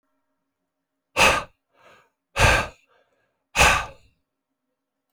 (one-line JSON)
{"exhalation_length": "5.1 s", "exhalation_amplitude": 23170, "exhalation_signal_mean_std_ratio": 0.31, "survey_phase": "beta (2021-08-13 to 2022-03-07)", "age": "45-64", "gender": "Male", "wearing_mask": "No", "symptom_cough_any": true, "symptom_runny_or_blocked_nose": true, "symptom_shortness_of_breath": true, "symptom_diarrhoea": true, "symptom_fatigue": true, "symptom_other": true, "smoker_status": "Ex-smoker", "respiratory_condition_asthma": true, "respiratory_condition_other": false, "recruitment_source": "Test and Trace", "submission_delay": "2 days", "covid_test_result": "Positive", "covid_test_method": "LFT"}